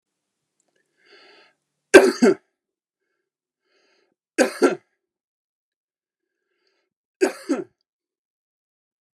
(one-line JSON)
{"three_cough_length": "9.1 s", "three_cough_amplitude": 32768, "three_cough_signal_mean_std_ratio": 0.2, "survey_phase": "beta (2021-08-13 to 2022-03-07)", "age": "45-64", "gender": "Male", "wearing_mask": "No", "symptom_sore_throat": true, "symptom_onset": "8 days", "smoker_status": "Never smoked", "respiratory_condition_asthma": true, "respiratory_condition_other": false, "recruitment_source": "REACT", "submission_delay": "1 day", "covid_test_result": "Negative", "covid_test_method": "RT-qPCR"}